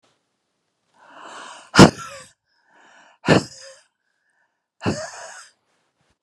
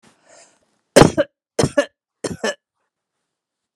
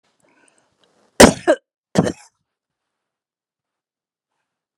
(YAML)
exhalation_length: 6.2 s
exhalation_amplitude: 32768
exhalation_signal_mean_std_ratio: 0.21
three_cough_length: 3.8 s
three_cough_amplitude: 32768
three_cough_signal_mean_std_ratio: 0.25
cough_length: 4.8 s
cough_amplitude: 32768
cough_signal_mean_std_ratio: 0.19
survey_phase: beta (2021-08-13 to 2022-03-07)
age: 65+
gender: Female
wearing_mask: 'No'
symptom_none: true
smoker_status: Ex-smoker
respiratory_condition_asthma: false
respiratory_condition_other: false
recruitment_source: REACT
submission_delay: 2 days
covid_test_result: Negative
covid_test_method: RT-qPCR
influenza_a_test_result: Negative
influenza_b_test_result: Negative